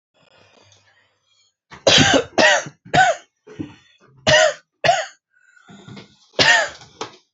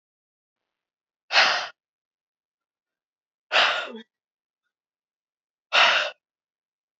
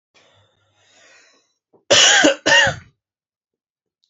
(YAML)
three_cough_length: 7.3 s
three_cough_amplitude: 29754
three_cough_signal_mean_std_ratio: 0.4
exhalation_length: 7.0 s
exhalation_amplitude: 20963
exhalation_signal_mean_std_ratio: 0.29
cough_length: 4.1 s
cough_amplitude: 29459
cough_signal_mean_std_ratio: 0.35
survey_phase: beta (2021-08-13 to 2022-03-07)
age: 18-44
gender: Male
wearing_mask: 'No'
symptom_diarrhoea: true
symptom_fatigue: true
symptom_headache: true
symptom_onset: 12 days
smoker_status: Never smoked
recruitment_source: REACT
submission_delay: 2 days
covid_test_result: Negative
covid_test_method: RT-qPCR
influenza_a_test_result: Negative
influenza_b_test_result: Negative